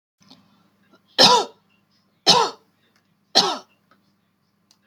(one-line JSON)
{"three_cough_length": "4.9 s", "three_cough_amplitude": 32768, "three_cough_signal_mean_std_ratio": 0.29, "survey_phase": "beta (2021-08-13 to 2022-03-07)", "age": "45-64", "gender": "Female", "wearing_mask": "No", "symptom_none": true, "smoker_status": "Ex-smoker", "respiratory_condition_asthma": false, "respiratory_condition_other": false, "recruitment_source": "REACT", "submission_delay": "2 days", "covid_test_result": "Negative", "covid_test_method": "RT-qPCR", "influenza_a_test_result": "Negative", "influenza_b_test_result": "Negative"}